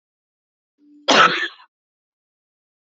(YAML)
cough_length: 2.8 s
cough_amplitude: 28807
cough_signal_mean_std_ratio: 0.27
survey_phase: beta (2021-08-13 to 2022-03-07)
age: 45-64
gender: Female
wearing_mask: 'No'
symptom_cough_any: true
symptom_runny_or_blocked_nose: true
symptom_sore_throat: true
symptom_fatigue: true
symptom_onset: 12 days
smoker_status: Never smoked
respiratory_condition_asthma: false
respiratory_condition_other: false
recruitment_source: REACT
submission_delay: 2 days
covid_test_result: Negative
covid_test_method: RT-qPCR
influenza_a_test_result: Negative
influenza_b_test_result: Negative